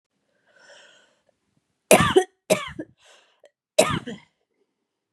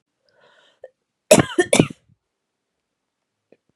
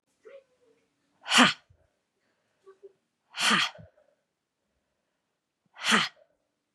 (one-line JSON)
{"three_cough_length": "5.1 s", "three_cough_amplitude": 32767, "three_cough_signal_mean_std_ratio": 0.26, "cough_length": "3.8 s", "cough_amplitude": 32768, "cough_signal_mean_std_ratio": 0.21, "exhalation_length": "6.7 s", "exhalation_amplitude": 18583, "exhalation_signal_mean_std_ratio": 0.26, "survey_phase": "beta (2021-08-13 to 2022-03-07)", "age": "18-44", "gender": "Female", "wearing_mask": "No", "symptom_shortness_of_breath": true, "symptom_onset": "3 days", "smoker_status": "Ex-smoker", "respiratory_condition_asthma": false, "respiratory_condition_other": false, "recruitment_source": "Test and Trace", "submission_delay": "1 day", "covid_test_result": "Negative", "covid_test_method": "RT-qPCR"}